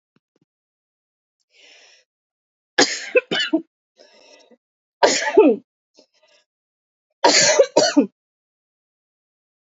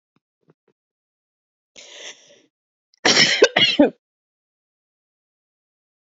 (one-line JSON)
{"three_cough_length": "9.6 s", "three_cough_amplitude": 32047, "three_cough_signal_mean_std_ratio": 0.31, "cough_length": "6.1 s", "cough_amplitude": 28976, "cough_signal_mean_std_ratio": 0.26, "survey_phase": "beta (2021-08-13 to 2022-03-07)", "age": "18-44", "gender": "Female", "wearing_mask": "No", "symptom_new_continuous_cough": true, "symptom_shortness_of_breath": true, "symptom_sore_throat": true, "symptom_fatigue": true, "symptom_headache": true, "symptom_change_to_sense_of_smell_or_taste": true, "symptom_onset": "3 days", "smoker_status": "Never smoked", "respiratory_condition_asthma": false, "respiratory_condition_other": false, "recruitment_source": "Test and Trace", "submission_delay": "1 day", "covid_test_result": "Positive", "covid_test_method": "RT-qPCR"}